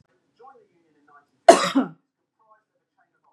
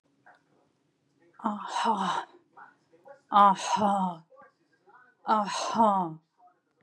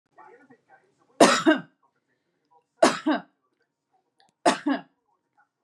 cough_length: 3.3 s
cough_amplitude: 32768
cough_signal_mean_std_ratio: 0.2
exhalation_length: 6.8 s
exhalation_amplitude: 13306
exhalation_signal_mean_std_ratio: 0.44
three_cough_length: 5.6 s
three_cough_amplitude: 31841
three_cough_signal_mean_std_ratio: 0.29
survey_phase: beta (2021-08-13 to 2022-03-07)
age: 45-64
gender: Female
wearing_mask: 'No'
symptom_fatigue: true
symptom_onset: 7 days
smoker_status: Never smoked
respiratory_condition_asthma: false
respiratory_condition_other: false
recruitment_source: REACT
submission_delay: 1 day
covid_test_result: Negative
covid_test_method: RT-qPCR
influenza_a_test_result: Negative
influenza_b_test_result: Negative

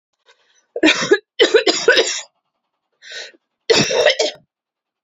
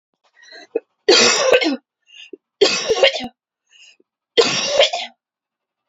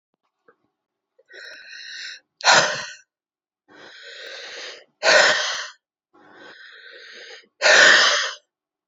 cough_length: 5.0 s
cough_amplitude: 32767
cough_signal_mean_std_ratio: 0.44
three_cough_length: 5.9 s
three_cough_amplitude: 32704
three_cough_signal_mean_std_ratio: 0.44
exhalation_length: 8.9 s
exhalation_amplitude: 30242
exhalation_signal_mean_std_ratio: 0.37
survey_phase: beta (2021-08-13 to 2022-03-07)
age: 18-44
gender: Female
wearing_mask: 'No'
symptom_cough_any: true
symptom_runny_or_blocked_nose: true
symptom_other: true
symptom_onset: 5 days
smoker_status: Ex-smoker
respiratory_condition_asthma: false
respiratory_condition_other: false
recruitment_source: REACT
submission_delay: 1 day
covid_test_result: Negative
covid_test_method: RT-qPCR
influenza_a_test_result: Negative
influenza_b_test_result: Negative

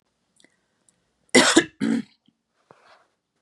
cough_length: 3.4 s
cough_amplitude: 31106
cough_signal_mean_std_ratio: 0.27
survey_phase: beta (2021-08-13 to 2022-03-07)
age: 18-44
gender: Female
wearing_mask: 'No'
symptom_none: true
smoker_status: Never smoked
respiratory_condition_asthma: false
respiratory_condition_other: false
recruitment_source: REACT
submission_delay: 2 days
covid_test_result: Negative
covid_test_method: RT-qPCR
influenza_a_test_result: Negative
influenza_b_test_result: Negative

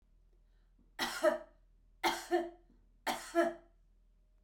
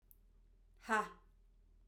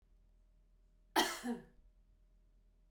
three_cough_length: 4.4 s
three_cough_amplitude: 4558
three_cough_signal_mean_std_ratio: 0.39
exhalation_length: 1.9 s
exhalation_amplitude: 2887
exhalation_signal_mean_std_ratio: 0.31
cough_length: 2.9 s
cough_amplitude: 3991
cough_signal_mean_std_ratio: 0.3
survey_phase: beta (2021-08-13 to 2022-03-07)
age: 45-64
gender: Female
wearing_mask: 'No'
symptom_none: true
smoker_status: Current smoker (e-cigarettes or vapes only)
respiratory_condition_asthma: true
respiratory_condition_other: false
recruitment_source: REACT
submission_delay: 1 day
covid_test_result: Negative
covid_test_method: RT-qPCR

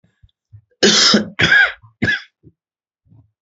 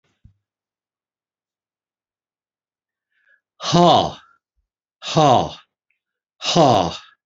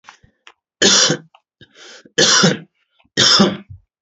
cough_length: 3.4 s
cough_amplitude: 29828
cough_signal_mean_std_ratio: 0.44
exhalation_length: 7.3 s
exhalation_amplitude: 31394
exhalation_signal_mean_std_ratio: 0.32
three_cough_length: 4.0 s
three_cough_amplitude: 32767
three_cough_signal_mean_std_ratio: 0.45
survey_phase: beta (2021-08-13 to 2022-03-07)
age: 65+
gender: Male
wearing_mask: 'No'
symptom_none: true
smoker_status: Never smoked
respiratory_condition_asthma: false
respiratory_condition_other: false
recruitment_source: REACT
submission_delay: 4 days
covid_test_result: Negative
covid_test_method: RT-qPCR
influenza_a_test_result: Unknown/Void
influenza_b_test_result: Unknown/Void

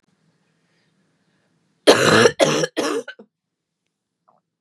cough_length: 4.6 s
cough_amplitude: 32768
cough_signal_mean_std_ratio: 0.33
survey_phase: beta (2021-08-13 to 2022-03-07)
age: 18-44
gender: Female
wearing_mask: 'No'
symptom_cough_any: true
symptom_shortness_of_breath: true
symptom_sore_throat: true
symptom_fatigue: true
symptom_headache: true
symptom_other: true
smoker_status: Never smoked
respiratory_condition_asthma: false
respiratory_condition_other: false
recruitment_source: Test and Trace
submission_delay: 1 day
covid_test_result: Positive
covid_test_method: LFT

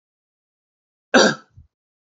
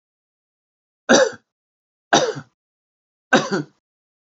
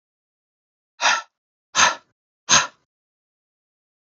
cough_length: 2.1 s
cough_amplitude: 29087
cough_signal_mean_std_ratio: 0.24
three_cough_length: 4.4 s
three_cough_amplitude: 28055
three_cough_signal_mean_std_ratio: 0.29
exhalation_length: 4.0 s
exhalation_amplitude: 31522
exhalation_signal_mean_std_ratio: 0.27
survey_phase: beta (2021-08-13 to 2022-03-07)
age: 45-64
gender: Male
wearing_mask: 'No'
symptom_none: true
smoker_status: Never smoked
respiratory_condition_asthma: false
respiratory_condition_other: false
recruitment_source: REACT
submission_delay: 2 days
covid_test_result: Negative
covid_test_method: RT-qPCR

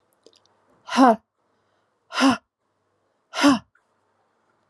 exhalation_length: 4.7 s
exhalation_amplitude: 26486
exhalation_signal_mean_std_ratio: 0.28
survey_phase: alpha (2021-03-01 to 2021-08-12)
age: 65+
gender: Female
wearing_mask: 'No'
symptom_diarrhoea: true
smoker_status: Ex-smoker
respiratory_condition_asthma: false
respiratory_condition_other: false
recruitment_source: Test and Trace
submission_delay: 1 day
covid_test_result: Positive
covid_test_method: RT-qPCR
covid_ct_value: 36.3
covid_ct_gene: ORF1ab gene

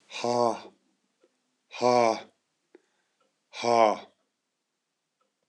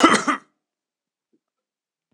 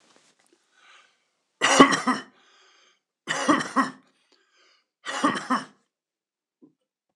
exhalation_length: 5.5 s
exhalation_amplitude: 14452
exhalation_signal_mean_std_ratio: 0.32
cough_length: 2.1 s
cough_amplitude: 26028
cough_signal_mean_std_ratio: 0.27
three_cough_length: 7.2 s
three_cough_amplitude: 26028
three_cough_signal_mean_std_ratio: 0.3
survey_phase: beta (2021-08-13 to 2022-03-07)
age: 45-64
gender: Male
wearing_mask: 'No'
symptom_none: true
smoker_status: Never smoked
respiratory_condition_asthma: false
respiratory_condition_other: false
recruitment_source: Test and Trace
submission_delay: 2 days
covid_test_result: Positive
covid_test_method: LAMP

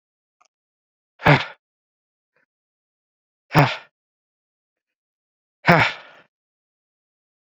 exhalation_length: 7.6 s
exhalation_amplitude: 28173
exhalation_signal_mean_std_ratio: 0.22
survey_phase: beta (2021-08-13 to 2022-03-07)
age: 18-44
gender: Male
wearing_mask: 'Yes'
symptom_cough_any: true
symptom_new_continuous_cough: true
symptom_runny_or_blocked_nose: true
symptom_shortness_of_breath: true
symptom_fever_high_temperature: true
symptom_headache: true
symptom_change_to_sense_of_smell_or_taste: true
symptom_loss_of_taste: true
symptom_onset: 4 days
smoker_status: Never smoked
respiratory_condition_asthma: false
respiratory_condition_other: false
recruitment_source: Test and Trace
submission_delay: 2 days
covid_test_result: Positive
covid_test_method: RT-qPCR
covid_ct_value: 16.6
covid_ct_gene: ORF1ab gene
covid_ct_mean: 17.0
covid_viral_load: 2600000 copies/ml
covid_viral_load_category: High viral load (>1M copies/ml)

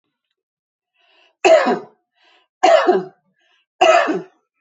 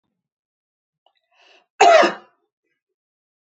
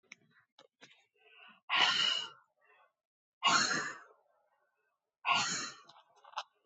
three_cough_length: 4.6 s
three_cough_amplitude: 30902
three_cough_signal_mean_std_ratio: 0.4
cough_length: 3.6 s
cough_amplitude: 27312
cough_signal_mean_std_ratio: 0.24
exhalation_length: 6.7 s
exhalation_amplitude: 7025
exhalation_signal_mean_std_ratio: 0.39
survey_phase: beta (2021-08-13 to 2022-03-07)
age: 45-64
gender: Female
wearing_mask: 'No'
symptom_none: true
smoker_status: Never smoked
respiratory_condition_asthma: false
respiratory_condition_other: false
recruitment_source: REACT
submission_delay: 1 day
covid_test_result: Negative
covid_test_method: RT-qPCR
influenza_a_test_result: Negative
influenza_b_test_result: Negative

